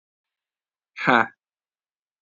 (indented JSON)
{
  "exhalation_length": "2.2 s",
  "exhalation_amplitude": 27355,
  "exhalation_signal_mean_std_ratio": 0.22,
  "survey_phase": "alpha (2021-03-01 to 2021-08-12)",
  "age": "18-44",
  "gender": "Male",
  "wearing_mask": "No",
  "symptom_cough_any": true,
  "symptom_fatigue": true,
  "symptom_fever_high_temperature": true,
  "smoker_status": "Never smoked",
  "respiratory_condition_asthma": false,
  "respiratory_condition_other": false,
  "recruitment_source": "Test and Trace",
  "submission_delay": "2 days",
  "covid_test_result": "Positive",
  "covid_test_method": "LFT"
}